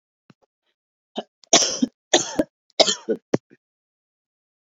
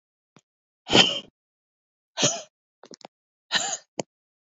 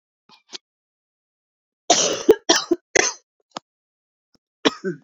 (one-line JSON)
{"three_cough_length": "4.7 s", "three_cough_amplitude": 32221, "three_cough_signal_mean_std_ratio": 0.28, "exhalation_length": "4.5 s", "exhalation_amplitude": 26164, "exhalation_signal_mean_std_ratio": 0.28, "cough_length": "5.0 s", "cough_amplitude": 29918, "cough_signal_mean_std_ratio": 0.29, "survey_phase": "beta (2021-08-13 to 2022-03-07)", "age": "18-44", "gender": "Female", "wearing_mask": "No", "symptom_cough_any": true, "symptom_shortness_of_breath": true, "symptom_sore_throat": true, "symptom_fatigue": true, "symptom_headache": true, "symptom_onset": "5 days", "smoker_status": "Never smoked", "respiratory_condition_asthma": false, "respiratory_condition_other": false, "recruitment_source": "Test and Trace", "submission_delay": "3 days", "covid_test_result": "Positive", "covid_test_method": "RT-qPCR"}